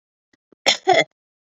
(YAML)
cough_length: 1.5 s
cough_amplitude: 30647
cough_signal_mean_std_ratio: 0.33
survey_phase: beta (2021-08-13 to 2022-03-07)
age: 45-64
gender: Female
wearing_mask: 'No'
symptom_runny_or_blocked_nose: true
symptom_abdominal_pain: true
symptom_headache: true
symptom_change_to_sense_of_smell_or_taste: true
smoker_status: Never smoked
respiratory_condition_asthma: false
respiratory_condition_other: false
recruitment_source: Test and Trace
submission_delay: 2 days
covid_test_result: Positive
covid_test_method: RT-qPCR